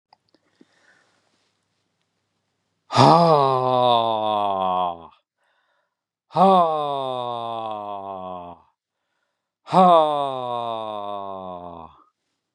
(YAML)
exhalation_length: 12.5 s
exhalation_amplitude: 31775
exhalation_signal_mean_std_ratio: 0.45
survey_phase: beta (2021-08-13 to 2022-03-07)
age: 65+
gender: Male
wearing_mask: 'No'
symptom_runny_or_blocked_nose: true
symptom_onset: 2 days
smoker_status: Never smoked
respiratory_condition_asthma: false
respiratory_condition_other: false
recruitment_source: REACT
submission_delay: 1 day
covid_test_result: Negative
covid_test_method: RT-qPCR
influenza_a_test_result: Negative
influenza_b_test_result: Negative